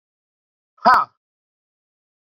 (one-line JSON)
{"exhalation_length": "2.2 s", "exhalation_amplitude": 28029, "exhalation_signal_mean_std_ratio": 0.22, "survey_phase": "beta (2021-08-13 to 2022-03-07)", "age": "45-64", "gender": "Male", "wearing_mask": "No", "symptom_none": true, "smoker_status": "Never smoked", "respiratory_condition_asthma": false, "respiratory_condition_other": false, "recruitment_source": "REACT", "submission_delay": "3 days", "covid_test_result": "Negative", "covid_test_method": "RT-qPCR"}